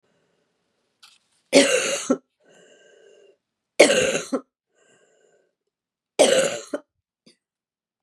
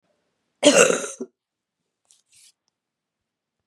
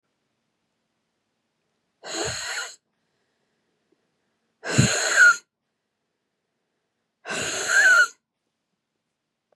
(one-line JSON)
{"three_cough_length": "8.0 s", "three_cough_amplitude": 32584, "three_cough_signal_mean_std_ratio": 0.31, "cough_length": "3.7 s", "cough_amplitude": 32572, "cough_signal_mean_std_ratio": 0.25, "exhalation_length": "9.6 s", "exhalation_amplitude": 22641, "exhalation_signal_mean_std_ratio": 0.32, "survey_phase": "beta (2021-08-13 to 2022-03-07)", "age": "45-64", "gender": "Female", "wearing_mask": "No", "symptom_cough_any": true, "symptom_runny_or_blocked_nose": true, "symptom_sore_throat": true, "symptom_diarrhoea": true, "symptom_other": true, "symptom_onset": "3 days", "smoker_status": "Never smoked", "respiratory_condition_asthma": false, "respiratory_condition_other": false, "recruitment_source": "Test and Trace", "submission_delay": "1 day", "covid_test_result": "Positive", "covid_test_method": "RT-qPCR", "covid_ct_value": 20.9, "covid_ct_gene": "ORF1ab gene", "covid_ct_mean": 21.0, "covid_viral_load": "130000 copies/ml", "covid_viral_load_category": "Low viral load (10K-1M copies/ml)"}